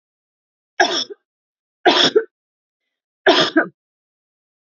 {"three_cough_length": "4.6 s", "three_cough_amplitude": 29203, "three_cough_signal_mean_std_ratio": 0.34, "survey_phase": "beta (2021-08-13 to 2022-03-07)", "age": "45-64", "gender": "Female", "wearing_mask": "No", "symptom_none": true, "smoker_status": "Never smoked", "respiratory_condition_asthma": false, "respiratory_condition_other": false, "recruitment_source": "REACT", "submission_delay": "2 days", "covid_test_result": "Negative", "covid_test_method": "RT-qPCR", "influenza_a_test_result": "Negative", "influenza_b_test_result": "Negative"}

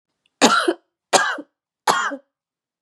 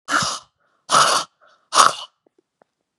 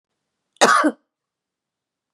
{"three_cough_length": "2.8 s", "three_cough_amplitude": 32767, "three_cough_signal_mean_std_ratio": 0.41, "exhalation_length": "3.0 s", "exhalation_amplitude": 32768, "exhalation_signal_mean_std_ratio": 0.39, "cough_length": "2.1 s", "cough_amplitude": 32502, "cough_signal_mean_std_ratio": 0.3, "survey_phase": "beta (2021-08-13 to 2022-03-07)", "age": "45-64", "gender": "Female", "wearing_mask": "No", "symptom_runny_or_blocked_nose": true, "symptom_sore_throat": true, "symptom_abdominal_pain": true, "symptom_fatigue": true, "symptom_headache": true, "symptom_onset": "5 days", "smoker_status": "Never smoked", "respiratory_condition_asthma": false, "respiratory_condition_other": false, "recruitment_source": "Test and Trace", "submission_delay": "2 days", "covid_test_result": "Positive", "covid_test_method": "RT-qPCR", "covid_ct_value": 17.1, "covid_ct_gene": "ORF1ab gene", "covid_ct_mean": 17.2, "covid_viral_load": "2200000 copies/ml", "covid_viral_load_category": "High viral load (>1M copies/ml)"}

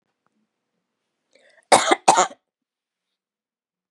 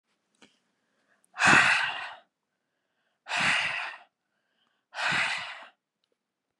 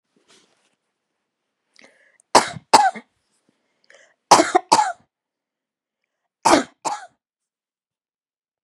{"cough_length": "3.9 s", "cough_amplitude": 32738, "cough_signal_mean_std_ratio": 0.23, "exhalation_length": "6.6 s", "exhalation_amplitude": 15949, "exhalation_signal_mean_std_ratio": 0.38, "three_cough_length": "8.6 s", "three_cough_amplitude": 32768, "three_cough_signal_mean_std_ratio": 0.24, "survey_phase": "beta (2021-08-13 to 2022-03-07)", "age": "18-44", "gender": "Female", "wearing_mask": "No", "symptom_none": true, "smoker_status": "Never smoked", "respiratory_condition_asthma": false, "respiratory_condition_other": false, "recruitment_source": "REACT", "submission_delay": "0 days", "covid_test_result": "Negative", "covid_test_method": "RT-qPCR", "influenza_a_test_result": "Negative", "influenza_b_test_result": "Negative"}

